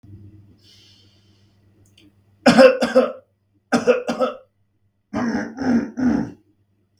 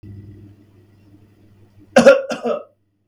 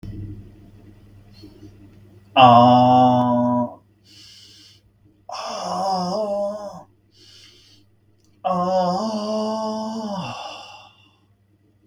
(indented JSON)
{
  "three_cough_length": "7.0 s",
  "three_cough_amplitude": 32768,
  "three_cough_signal_mean_std_ratio": 0.4,
  "cough_length": "3.1 s",
  "cough_amplitude": 32768,
  "cough_signal_mean_std_ratio": 0.29,
  "exhalation_length": "11.9 s",
  "exhalation_amplitude": 32768,
  "exhalation_signal_mean_std_ratio": 0.48,
  "survey_phase": "beta (2021-08-13 to 2022-03-07)",
  "age": "18-44",
  "gender": "Male",
  "wearing_mask": "No",
  "symptom_runny_or_blocked_nose": true,
  "symptom_headache": true,
  "symptom_onset": "12 days",
  "smoker_status": "Never smoked",
  "respiratory_condition_asthma": false,
  "respiratory_condition_other": false,
  "recruitment_source": "REACT",
  "submission_delay": "4 days",
  "covid_test_result": "Negative",
  "covid_test_method": "RT-qPCR",
  "influenza_a_test_result": "Negative",
  "influenza_b_test_result": "Negative"
}